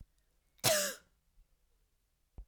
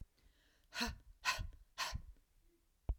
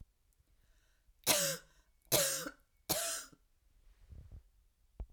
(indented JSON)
{
  "cough_length": "2.5 s",
  "cough_amplitude": 5241,
  "cough_signal_mean_std_ratio": 0.29,
  "exhalation_length": "3.0 s",
  "exhalation_amplitude": 2512,
  "exhalation_signal_mean_std_ratio": 0.43,
  "three_cough_length": "5.1 s",
  "three_cough_amplitude": 5995,
  "three_cough_signal_mean_std_ratio": 0.37,
  "survey_phase": "alpha (2021-03-01 to 2021-08-12)",
  "age": "45-64",
  "gender": "Female",
  "wearing_mask": "No",
  "symptom_fatigue": true,
  "smoker_status": "Never smoked",
  "respiratory_condition_asthma": false,
  "respiratory_condition_other": false,
  "recruitment_source": "REACT",
  "submission_delay": "2 days",
  "covid_test_result": "Negative",
  "covid_test_method": "RT-qPCR"
}